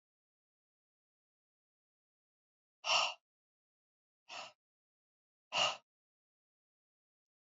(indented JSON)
{
  "exhalation_length": "7.5 s",
  "exhalation_amplitude": 3627,
  "exhalation_signal_mean_std_ratio": 0.21,
  "survey_phase": "beta (2021-08-13 to 2022-03-07)",
  "age": "45-64",
  "gender": "Female",
  "wearing_mask": "No",
  "symptom_none": true,
  "smoker_status": "Current smoker (e-cigarettes or vapes only)",
  "respiratory_condition_asthma": false,
  "respiratory_condition_other": false,
  "recruitment_source": "Test and Trace",
  "submission_delay": "-1 day",
  "covid_test_result": "Negative",
  "covid_test_method": "LFT"
}